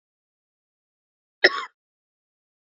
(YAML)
cough_length: 2.6 s
cough_amplitude: 31362
cough_signal_mean_std_ratio: 0.14
survey_phase: beta (2021-08-13 to 2022-03-07)
age: 18-44
gender: Female
wearing_mask: 'No'
symptom_cough_any: true
symptom_runny_or_blocked_nose: true
symptom_sore_throat: true
symptom_fatigue: true
symptom_fever_high_temperature: true
symptom_headache: true
symptom_other: true
smoker_status: Ex-smoker
respiratory_condition_asthma: true
respiratory_condition_other: false
recruitment_source: Test and Trace
submission_delay: 1 day
covid_test_result: Positive
covid_test_method: RT-qPCR